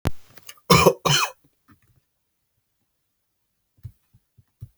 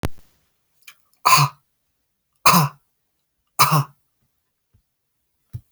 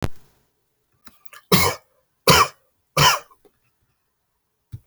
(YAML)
cough_length: 4.8 s
cough_amplitude: 32625
cough_signal_mean_std_ratio: 0.27
exhalation_length: 5.7 s
exhalation_amplitude: 32768
exhalation_signal_mean_std_ratio: 0.29
three_cough_length: 4.9 s
three_cough_amplitude: 32465
three_cough_signal_mean_std_ratio: 0.31
survey_phase: beta (2021-08-13 to 2022-03-07)
age: 18-44
gender: Male
wearing_mask: 'No'
symptom_none: true
smoker_status: Never smoked
respiratory_condition_asthma: false
respiratory_condition_other: false
recruitment_source: REACT
submission_delay: 3 days
covid_test_result: Negative
covid_test_method: RT-qPCR
influenza_a_test_result: Negative
influenza_b_test_result: Negative